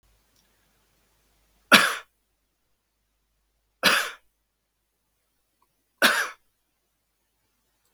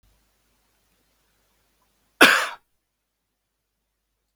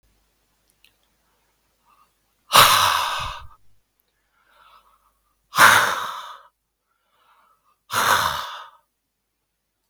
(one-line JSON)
{"three_cough_length": "7.9 s", "three_cough_amplitude": 32768, "three_cough_signal_mean_std_ratio": 0.21, "cough_length": "4.4 s", "cough_amplitude": 32768, "cough_signal_mean_std_ratio": 0.18, "exhalation_length": "9.9 s", "exhalation_amplitude": 32767, "exhalation_signal_mean_std_ratio": 0.31, "survey_phase": "beta (2021-08-13 to 2022-03-07)", "age": "65+", "gender": "Male", "wearing_mask": "No", "symptom_runny_or_blocked_nose": true, "smoker_status": "Never smoked", "respiratory_condition_asthma": false, "respiratory_condition_other": false, "recruitment_source": "REACT", "submission_delay": "1 day", "covid_test_result": "Negative", "covid_test_method": "RT-qPCR", "influenza_a_test_result": "Negative", "influenza_b_test_result": "Negative"}